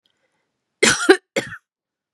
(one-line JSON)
{"cough_length": "2.1 s", "cough_amplitude": 32767, "cough_signal_mean_std_ratio": 0.29, "survey_phase": "beta (2021-08-13 to 2022-03-07)", "age": "45-64", "gender": "Female", "wearing_mask": "No", "symptom_none": true, "smoker_status": "Ex-smoker", "respiratory_condition_asthma": false, "respiratory_condition_other": false, "recruitment_source": "REACT", "submission_delay": "2 days", "covid_test_result": "Negative", "covid_test_method": "RT-qPCR"}